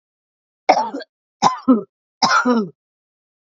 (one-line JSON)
{"three_cough_length": "3.4 s", "three_cough_amplitude": 29405, "three_cough_signal_mean_std_ratio": 0.42, "survey_phase": "beta (2021-08-13 to 2022-03-07)", "age": "18-44", "gender": "Female", "wearing_mask": "No", "symptom_cough_any": true, "symptom_sore_throat": true, "symptom_onset": "5 days", "smoker_status": "Current smoker (11 or more cigarettes per day)", "respiratory_condition_asthma": false, "respiratory_condition_other": false, "recruitment_source": "REACT", "submission_delay": "4 days", "covid_test_result": "Negative", "covid_test_method": "RT-qPCR", "influenza_a_test_result": "Negative", "influenza_b_test_result": "Negative"}